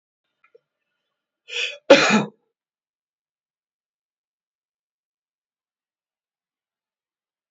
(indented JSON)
{
  "cough_length": "7.5 s",
  "cough_amplitude": 27998,
  "cough_signal_mean_std_ratio": 0.17,
  "survey_phase": "beta (2021-08-13 to 2022-03-07)",
  "age": "65+",
  "gender": "Male",
  "wearing_mask": "No",
  "symptom_none": true,
  "smoker_status": "Ex-smoker",
  "respiratory_condition_asthma": false,
  "respiratory_condition_other": false,
  "recruitment_source": "REACT",
  "submission_delay": "2 days",
  "covid_test_result": "Negative",
  "covid_test_method": "RT-qPCR"
}